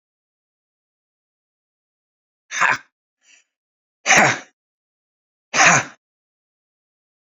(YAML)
exhalation_length: 7.3 s
exhalation_amplitude: 29238
exhalation_signal_mean_std_ratio: 0.25
survey_phase: beta (2021-08-13 to 2022-03-07)
age: 65+
gender: Male
wearing_mask: 'No'
symptom_cough_any: true
symptom_onset: 2 days
smoker_status: Ex-smoker
respiratory_condition_asthma: true
respiratory_condition_other: false
recruitment_source: Test and Trace
submission_delay: 1 day
covid_test_result: Negative
covid_test_method: RT-qPCR